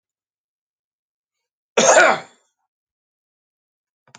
{
  "cough_length": "4.2 s",
  "cough_amplitude": 29287,
  "cough_signal_mean_std_ratio": 0.24,
  "survey_phase": "beta (2021-08-13 to 2022-03-07)",
  "age": "65+",
  "gender": "Male",
  "wearing_mask": "No",
  "symptom_cough_any": true,
  "symptom_shortness_of_breath": true,
  "smoker_status": "Ex-smoker",
  "respiratory_condition_asthma": false,
  "respiratory_condition_other": true,
  "recruitment_source": "REACT",
  "submission_delay": "0 days",
  "covid_test_result": "Negative",
  "covid_test_method": "RT-qPCR"
}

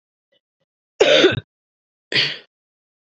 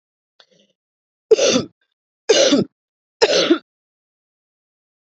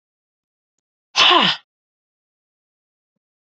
{
  "cough_length": "3.2 s",
  "cough_amplitude": 28238,
  "cough_signal_mean_std_ratio": 0.33,
  "three_cough_length": "5.0 s",
  "three_cough_amplitude": 28073,
  "three_cough_signal_mean_std_ratio": 0.35,
  "exhalation_length": "3.6 s",
  "exhalation_amplitude": 32767,
  "exhalation_signal_mean_std_ratio": 0.26,
  "survey_phase": "beta (2021-08-13 to 2022-03-07)",
  "age": "45-64",
  "gender": "Female",
  "wearing_mask": "No",
  "symptom_cough_any": true,
  "symptom_new_continuous_cough": true,
  "symptom_runny_or_blocked_nose": true,
  "symptom_sore_throat": true,
  "symptom_abdominal_pain": true,
  "symptom_onset": "2 days",
  "smoker_status": "Never smoked",
  "respiratory_condition_asthma": false,
  "respiratory_condition_other": false,
  "recruitment_source": "Test and Trace",
  "submission_delay": "1 day",
  "covid_test_result": "Positive",
  "covid_test_method": "RT-qPCR",
  "covid_ct_value": 23.2,
  "covid_ct_gene": "N gene"
}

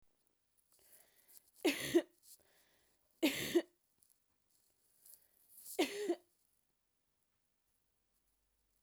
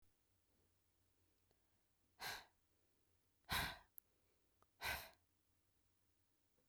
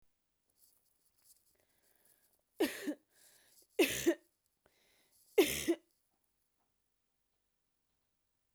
{
  "three_cough_length": "8.8 s",
  "three_cough_amplitude": 3214,
  "three_cough_signal_mean_std_ratio": 0.26,
  "exhalation_length": "6.7 s",
  "exhalation_amplitude": 1016,
  "exhalation_signal_mean_std_ratio": 0.28,
  "cough_length": "8.5 s",
  "cough_amplitude": 5226,
  "cough_signal_mean_std_ratio": 0.24,
  "survey_phase": "beta (2021-08-13 to 2022-03-07)",
  "age": "45-64",
  "gender": "Female",
  "wearing_mask": "No",
  "symptom_sore_throat": true,
  "symptom_fatigue": true,
  "symptom_headache": true,
  "smoker_status": "Never smoked",
  "respiratory_condition_asthma": false,
  "respiratory_condition_other": false,
  "recruitment_source": "Test and Trace",
  "submission_delay": "2 days",
  "covid_test_result": "Positive",
  "covid_test_method": "RT-qPCR",
  "covid_ct_value": 29.4,
  "covid_ct_gene": "ORF1ab gene"
}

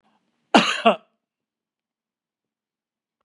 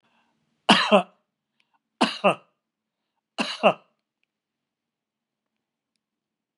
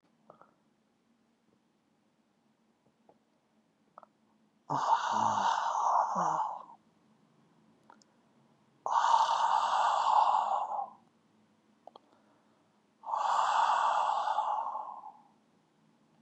{
  "cough_length": "3.2 s",
  "cough_amplitude": 32722,
  "cough_signal_mean_std_ratio": 0.22,
  "three_cough_length": "6.6 s",
  "three_cough_amplitude": 26466,
  "three_cough_signal_mean_std_ratio": 0.24,
  "exhalation_length": "16.2 s",
  "exhalation_amplitude": 7073,
  "exhalation_signal_mean_std_ratio": 0.51,
  "survey_phase": "beta (2021-08-13 to 2022-03-07)",
  "age": "65+",
  "gender": "Male",
  "wearing_mask": "No",
  "symptom_none": true,
  "smoker_status": "Ex-smoker",
  "respiratory_condition_asthma": false,
  "respiratory_condition_other": false,
  "recruitment_source": "REACT",
  "submission_delay": "1 day",
  "covid_test_result": "Negative",
  "covid_test_method": "RT-qPCR",
  "influenza_a_test_result": "Negative",
  "influenza_b_test_result": "Negative"
}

